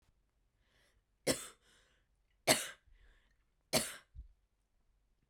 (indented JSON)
{
  "three_cough_length": "5.3 s",
  "three_cough_amplitude": 7073,
  "three_cough_signal_mean_std_ratio": 0.23,
  "survey_phase": "beta (2021-08-13 to 2022-03-07)",
  "age": "18-44",
  "gender": "Female",
  "wearing_mask": "No",
  "symptom_none": true,
  "smoker_status": "Never smoked",
  "respiratory_condition_asthma": false,
  "respiratory_condition_other": false,
  "recruitment_source": "REACT",
  "submission_delay": "4 days",
  "covid_test_result": "Negative",
  "covid_test_method": "RT-qPCR"
}